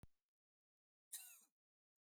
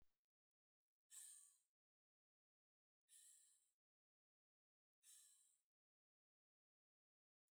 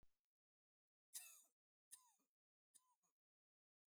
cough_length: 2.0 s
cough_amplitude: 471
cough_signal_mean_std_ratio: 0.29
exhalation_length: 7.5 s
exhalation_amplitude: 136
exhalation_signal_mean_std_ratio: 0.31
three_cough_length: 3.9 s
three_cough_amplitude: 398
three_cough_signal_mean_std_ratio: 0.24
survey_phase: beta (2021-08-13 to 2022-03-07)
age: 65+
gender: Female
wearing_mask: 'No'
symptom_none: true
smoker_status: Never smoked
respiratory_condition_asthma: false
respiratory_condition_other: false
recruitment_source: REACT
submission_delay: 1 day
covid_test_result: Negative
covid_test_method: RT-qPCR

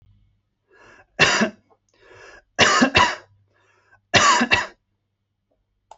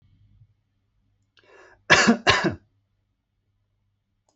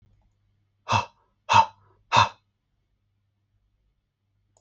three_cough_length: 6.0 s
three_cough_amplitude: 30095
three_cough_signal_mean_std_ratio: 0.38
cough_length: 4.4 s
cough_amplitude: 28168
cough_signal_mean_std_ratio: 0.27
exhalation_length: 4.6 s
exhalation_amplitude: 22031
exhalation_signal_mean_std_ratio: 0.24
survey_phase: alpha (2021-03-01 to 2021-08-12)
age: 18-44
gender: Male
wearing_mask: 'No'
symptom_new_continuous_cough: true
symptom_diarrhoea: true
symptom_headache: true
smoker_status: Ex-smoker
respiratory_condition_asthma: false
respiratory_condition_other: false
recruitment_source: Test and Trace
submission_delay: 2 days
covid_test_result: Positive
covid_test_method: RT-qPCR
covid_ct_value: 19.5
covid_ct_gene: ORF1ab gene
covid_ct_mean: 20.2
covid_viral_load: 240000 copies/ml
covid_viral_load_category: Low viral load (10K-1M copies/ml)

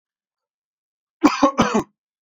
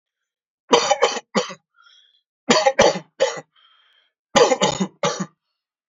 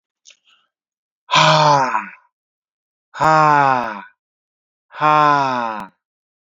cough_length: 2.2 s
cough_amplitude: 27538
cough_signal_mean_std_ratio: 0.33
three_cough_length: 5.9 s
three_cough_amplitude: 30380
three_cough_signal_mean_std_ratio: 0.4
exhalation_length: 6.5 s
exhalation_amplitude: 29620
exhalation_signal_mean_std_ratio: 0.46
survey_phase: beta (2021-08-13 to 2022-03-07)
age: 18-44
gender: Male
wearing_mask: 'No'
symptom_none: true
symptom_onset: 6 days
smoker_status: Never smoked
respiratory_condition_asthma: false
respiratory_condition_other: false
recruitment_source: REACT
submission_delay: 1 day
covid_test_result: Negative
covid_test_method: RT-qPCR
influenza_a_test_result: Negative
influenza_b_test_result: Negative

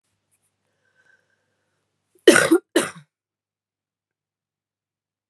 cough_length: 5.3 s
cough_amplitude: 32768
cough_signal_mean_std_ratio: 0.19
survey_phase: beta (2021-08-13 to 2022-03-07)
age: 18-44
gender: Female
wearing_mask: 'No'
symptom_cough_any: true
symptom_runny_or_blocked_nose: true
symptom_shortness_of_breath: true
symptom_sore_throat: true
symptom_abdominal_pain: true
symptom_fatigue: true
symptom_headache: true
symptom_change_to_sense_of_smell_or_taste: true
symptom_loss_of_taste: true
symptom_onset: 4 days
smoker_status: Current smoker (1 to 10 cigarettes per day)
respiratory_condition_asthma: true
respiratory_condition_other: false
recruitment_source: Test and Trace
submission_delay: 2 days
covid_test_result: Positive
covid_test_method: RT-qPCR
covid_ct_value: 16.8
covid_ct_gene: N gene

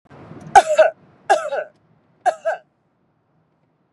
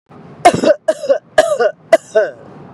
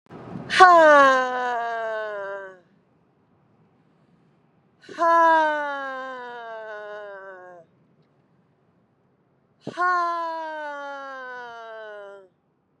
three_cough_length: 3.9 s
three_cough_amplitude: 32768
three_cough_signal_mean_std_ratio: 0.32
cough_length: 2.7 s
cough_amplitude: 32768
cough_signal_mean_std_ratio: 0.49
exhalation_length: 12.8 s
exhalation_amplitude: 32760
exhalation_signal_mean_std_ratio: 0.4
survey_phase: beta (2021-08-13 to 2022-03-07)
age: 45-64
gender: Female
wearing_mask: 'No'
symptom_none: true
symptom_onset: 4 days
smoker_status: Never smoked
respiratory_condition_asthma: false
respiratory_condition_other: false
recruitment_source: REACT
submission_delay: 1 day
covid_test_result: Negative
covid_test_method: RT-qPCR
influenza_a_test_result: Negative
influenza_b_test_result: Negative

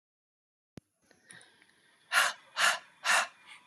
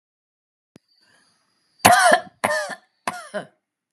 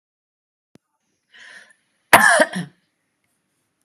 exhalation_length: 3.7 s
exhalation_amplitude: 8457
exhalation_signal_mean_std_ratio: 0.34
three_cough_length: 3.9 s
three_cough_amplitude: 32768
three_cough_signal_mean_std_ratio: 0.31
cough_length: 3.8 s
cough_amplitude: 32768
cough_signal_mean_std_ratio: 0.24
survey_phase: beta (2021-08-13 to 2022-03-07)
age: 45-64
gender: Female
wearing_mask: 'No'
symptom_none: true
smoker_status: Never smoked
respiratory_condition_asthma: false
respiratory_condition_other: false
recruitment_source: REACT
submission_delay: 1 day
covid_test_result: Negative
covid_test_method: RT-qPCR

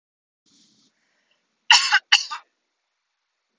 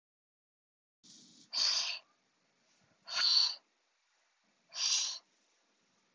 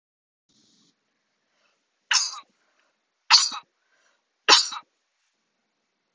cough_length: 3.6 s
cough_amplitude: 30284
cough_signal_mean_std_ratio: 0.24
exhalation_length: 6.1 s
exhalation_amplitude: 5026
exhalation_signal_mean_std_ratio: 0.37
three_cough_length: 6.1 s
three_cough_amplitude: 31337
three_cough_signal_mean_std_ratio: 0.22
survey_phase: beta (2021-08-13 to 2022-03-07)
age: 18-44
gender: Female
wearing_mask: 'No'
symptom_none: true
smoker_status: Ex-smoker
respiratory_condition_asthma: false
respiratory_condition_other: false
recruitment_source: REACT
submission_delay: 1 day
covid_test_result: Negative
covid_test_method: RT-qPCR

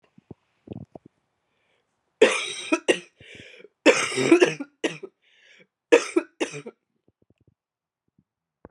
three_cough_length: 8.7 s
three_cough_amplitude: 27386
three_cough_signal_mean_std_ratio: 0.29
survey_phase: beta (2021-08-13 to 2022-03-07)
age: 18-44
gender: Female
wearing_mask: 'No'
symptom_cough_any: true
symptom_sore_throat: true
symptom_fatigue: true
symptom_onset: 3 days
smoker_status: Never smoked
respiratory_condition_asthma: false
respiratory_condition_other: false
recruitment_source: Test and Trace
submission_delay: 2 days
covid_test_result: Positive
covid_test_method: RT-qPCR
covid_ct_value: 28.9
covid_ct_gene: N gene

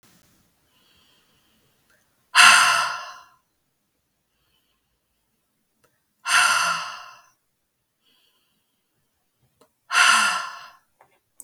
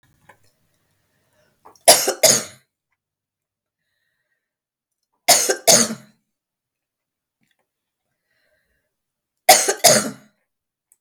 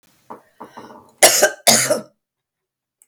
exhalation_length: 11.4 s
exhalation_amplitude: 32768
exhalation_signal_mean_std_ratio: 0.3
three_cough_length: 11.0 s
three_cough_amplitude: 32768
three_cough_signal_mean_std_ratio: 0.26
cough_length: 3.1 s
cough_amplitude: 32768
cough_signal_mean_std_ratio: 0.35
survey_phase: beta (2021-08-13 to 2022-03-07)
age: 45-64
gender: Female
wearing_mask: 'No'
symptom_none: true
symptom_onset: 5 days
smoker_status: Never smoked
respiratory_condition_asthma: false
respiratory_condition_other: false
recruitment_source: REACT
submission_delay: 6 days
covid_test_result: Negative
covid_test_method: RT-qPCR
influenza_a_test_result: Unknown/Void
influenza_b_test_result: Unknown/Void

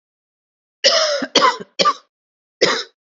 cough_length: 3.2 s
cough_amplitude: 32129
cough_signal_mean_std_ratio: 0.44
survey_phase: beta (2021-08-13 to 2022-03-07)
age: 45-64
gender: Female
wearing_mask: 'No'
symptom_new_continuous_cough: true
symptom_sore_throat: true
symptom_fatigue: true
symptom_fever_high_temperature: true
symptom_onset: 2 days
smoker_status: Ex-smoker
respiratory_condition_asthma: false
respiratory_condition_other: false
recruitment_source: Test and Trace
submission_delay: 1 day
covid_test_result: Positive
covid_test_method: RT-qPCR
covid_ct_value: 27.3
covid_ct_gene: ORF1ab gene
covid_ct_mean: 27.3
covid_viral_load: 1100 copies/ml
covid_viral_load_category: Minimal viral load (< 10K copies/ml)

